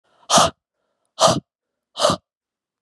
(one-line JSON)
{"exhalation_length": "2.8 s", "exhalation_amplitude": 31476, "exhalation_signal_mean_std_ratio": 0.34, "survey_phase": "beta (2021-08-13 to 2022-03-07)", "age": "18-44", "gender": "Female", "wearing_mask": "No", "symptom_cough_any": true, "symptom_runny_or_blocked_nose": true, "symptom_shortness_of_breath": true, "symptom_fatigue": true, "symptom_fever_high_temperature": true, "symptom_headache": true, "symptom_change_to_sense_of_smell_or_taste": true, "symptom_loss_of_taste": true, "symptom_other": true, "symptom_onset": "3 days", "smoker_status": "Ex-smoker", "respiratory_condition_asthma": false, "respiratory_condition_other": false, "recruitment_source": "Test and Trace", "submission_delay": "2 days", "covid_test_result": "Positive", "covid_test_method": "RT-qPCR", "covid_ct_value": 31.4, "covid_ct_gene": "ORF1ab gene"}